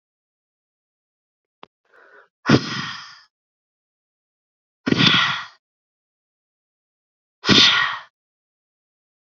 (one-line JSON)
{"exhalation_length": "9.2 s", "exhalation_amplitude": 29223, "exhalation_signal_mean_std_ratio": 0.29, "survey_phase": "beta (2021-08-13 to 2022-03-07)", "age": "18-44", "gender": "Female", "wearing_mask": "No", "symptom_none": true, "smoker_status": "Ex-smoker", "respiratory_condition_asthma": false, "respiratory_condition_other": false, "recruitment_source": "REACT", "submission_delay": "0 days", "covid_test_result": "Negative", "covid_test_method": "RT-qPCR", "influenza_a_test_result": "Negative", "influenza_b_test_result": "Negative"}